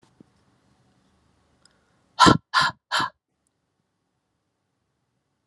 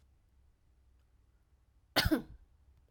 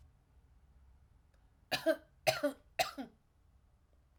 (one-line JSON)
{"exhalation_length": "5.5 s", "exhalation_amplitude": 27290, "exhalation_signal_mean_std_ratio": 0.22, "cough_length": "2.9 s", "cough_amplitude": 6135, "cough_signal_mean_std_ratio": 0.24, "three_cough_length": "4.2 s", "three_cough_amplitude": 5540, "three_cough_signal_mean_std_ratio": 0.3, "survey_phase": "alpha (2021-03-01 to 2021-08-12)", "age": "18-44", "gender": "Female", "wearing_mask": "No", "symptom_none": true, "smoker_status": "Ex-smoker", "respiratory_condition_asthma": true, "respiratory_condition_other": false, "recruitment_source": "REACT", "submission_delay": "1 day", "covid_test_result": "Negative", "covid_test_method": "RT-qPCR"}